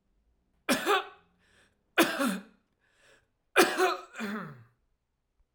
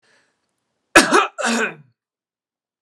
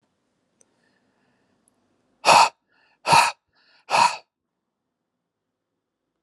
{
  "three_cough_length": "5.5 s",
  "three_cough_amplitude": 15325,
  "three_cough_signal_mean_std_ratio": 0.37,
  "cough_length": "2.8 s",
  "cough_amplitude": 32768,
  "cough_signal_mean_std_ratio": 0.32,
  "exhalation_length": "6.2 s",
  "exhalation_amplitude": 29377,
  "exhalation_signal_mean_std_ratio": 0.25,
  "survey_phase": "alpha (2021-03-01 to 2021-08-12)",
  "age": "45-64",
  "gender": "Male",
  "wearing_mask": "No",
  "symptom_none": true,
  "smoker_status": "Ex-smoker",
  "respiratory_condition_asthma": false,
  "respiratory_condition_other": false,
  "recruitment_source": "REACT",
  "submission_delay": "1 day",
  "covid_test_result": "Negative",
  "covid_test_method": "RT-qPCR"
}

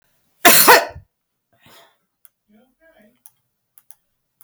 {
  "cough_length": "4.4 s",
  "cough_amplitude": 32768,
  "cough_signal_mean_std_ratio": 0.25,
  "survey_phase": "beta (2021-08-13 to 2022-03-07)",
  "age": "45-64",
  "gender": "Female",
  "wearing_mask": "No",
  "symptom_runny_or_blocked_nose": true,
  "symptom_fatigue": true,
  "symptom_onset": "12 days",
  "smoker_status": "Never smoked",
  "respiratory_condition_asthma": false,
  "respiratory_condition_other": false,
  "recruitment_source": "REACT",
  "submission_delay": "8 days",
  "covid_test_result": "Negative",
  "covid_test_method": "RT-qPCR",
  "influenza_a_test_result": "Negative",
  "influenza_b_test_result": "Negative"
}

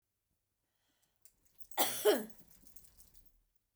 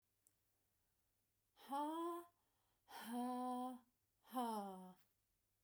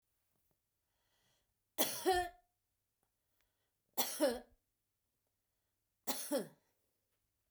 {
  "cough_length": "3.8 s",
  "cough_amplitude": 5149,
  "cough_signal_mean_std_ratio": 0.28,
  "exhalation_length": "5.6 s",
  "exhalation_amplitude": 637,
  "exhalation_signal_mean_std_ratio": 0.54,
  "three_cough_length": "7.5 s",
  "three_cough_amplitude": 5410,
  "three_cough_signal_mean_std_ratio": 0.29,
  "survey_phase": "beta (2021-08-13 to 2022-03-07)",
  "age": "45-64",
  "gender": "Female",
  "wearing_mask": "No",
  "symptom_none": true,
  "smoker_status": "Never smoked",
  "respiratory_condition_asthma": false,
  "respiratory_condition_other": false,
  "recruitment_source": "REACT",
  "submission_delay": "1 day",
  "covid_test_result": "Negative",
  "covid_test_method": "RT-qPCR",
  "influenza_a_test_result": "Negative",
  "influenza_b_test_result": "Negative"
}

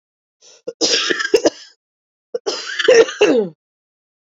{
  "cough_length": "4.4 s",
  "cough_amplitude": 29750,
  "cough_signal_mean_std_ratio": 0.43,
  "survey_phase": "beta (2021-08-13 to 2022-03-07)",
  "age": "45-64",
  "gender": "Female",
  "wearing_mask": "No",
  "symptom_cough_any": true,
  "symptom_new_continuous_cough": true,
  "symptom_runny_or_blocked_nose": true,
  "symptom_fatigue": true,
  "symptom_fever_high_temperature": true,
  "symptom_headache": true,
  "smoker_status": "Never smoked",
  "respiratory_condition_asthma": true,
  "respiratory_condition_other": false,
  "recruitment_source": "Test and Trace",
  "submission_delay": "2 days",
  "covid_test_result": "Positive",
  "covid_test_method": "LFT"
}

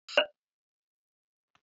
{
  "cough_length": "1.6 s",
  "cough_amplitude": 11366,
  "cough_signal_mean_std_ratio": 0.18,
  "survey_phase": "beta (2021-08-13 to 2022-03-07)",
  "age": "65+",
  "gender": "Female",
  "wearing_mask": "No",
  "symptom_cough_any": true,
  "symptom_shortness_of_breath": true,
  "symptom_fatigue": true,
  "symptom_change_to_sense_of_smell_or_taste": true,
  "symptom_loss_of_taste": true,
  "symptom_onset": "9 days",
  "smoker_status": "Never smoked",
  "respiratory_condition_asthma": false,
  "respiratory_condition_other": false,
  "recruitment_source": "Test and Trace",
  "submission_delay": "8 days",
  "covid_test_result": "Positive",
  "covid_test_method": "RT-qPCR",
  "covid_ct_value": 15.4,
  "covid_ct_gene": "ORF1ab gene",
  "covid_ct_mean": 15.6,
  "covid_viral_load": "7600000 copies/ml",
  "covid_viral_load_category": "High viral load (>1M copies/ml)"
}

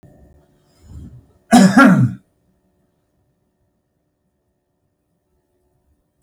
{
  "cough_length": "6.2 s",
  "cough_amplitude": 32768,
  "cough_signal_mean_std_ratio": 0.26,
  "survey_phase": "beta (2021-08-13 to 2022-03-07)",
  "age": "65+",
  "gender": "Male",
  "wearing_mask": "No",
  "symptom_none": true,
  "smoker_status": "Ex-smoker",
  "respiratory_condition_asthma": true,
  "respiratory_condition_other": false,
  "recruitment_source": "REACT",
  "submission_delay": "1 day",
  "covid_test_result": "Negative",
  "covid_test_method": "RT-qPCR",
  "influenza_a_test_result": "Negative",
  "influenza_b_test_result": "Negative"
}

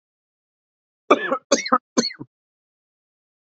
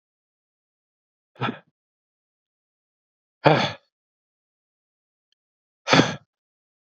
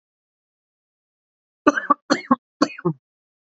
{
  "cough_length": "3.4 s",
  "cough_amplitude": 27702,
  "cough_signal_mean_std_ratio": 0.27,
  "exhalation_length": "7.0 s",
  "exhalation_amplitude": 27627,
  "exhalation_signal_mean_std_ratio": 0.21,
  "three_cough_length": "3.5 s",
  "three_cough_amplitude": 27442,
  "three_cough_signal_mean_std_ratio": 0.25,
  "survey_phase": "beta (2021-08-13 to 2022-03-07)",
  "age": "18-44",
  "gender": "Male",
  "wearing_mask": "No",
  "symptom_cough_any": true,
  "symptom_runny_or_blocked_nose": true,
  "symptom_shortness_of_breath": true,
  "symptom_fatigue": true,
  "symptom_fever_high_temperature": true,
  "smoker_status": "Never smoked",
  "respiratory_condition_asthma": true,
  "respiratory_condition_other": false,
  "recruitment_source": "Test and Trace",
  "submission_delay": "1 day",
  "covid_test_result": "Positive",
  "covid_test_method": "RT-qPCR"
}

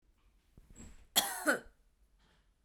{
  "cough_length": "2.6 s",
  "cough_amplitude": 6879,
  "cough_signal_mean_std_ratio": 0.3,
  "survey_phase": "beta (2021-08-13 to 2022-03-07)",
  "age": "18-44",
  "gender": "Female",
  "wearing_mask": "No",
  "symptom_none": true,
  "smoker_status": "Never smoked",
  "respiratory_condition_asthma": true,
  "respiratory_condition_other": false,
  "recruitment_source": "REACT",
  "submission_delay": "2 days",
  "covid_test_result": "Negative",
  "covid_test_method": "RT-qPCR",
  "influenza_a_test_result": "Negative",
  "influenza_b_test_result": "Negative"
}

